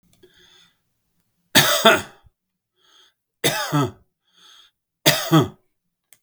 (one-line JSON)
{"three_cough_length": "6.2 s", "three_cough_amplitude": 32766, "three_cough_signal_mean_std_ratio": 0.33, "survey_phase": "beta (2021-08-13 to 2022-03-07)", "age": "65+", "gender": "Male", "wearing_mask": "No", "symptom_none": true, "smoker_status": "Never smoked", "respiratory_condition_asthma": false, "respiratory_condition_other": false, "recruitment_source": "REACT", "submission_delay": "2 days", "covid_test_result": "Negative", "covid_test_method": "RT-qPCR", "influenza_a_test_result": "Negative", "influenza_b_test_result": "Negative"}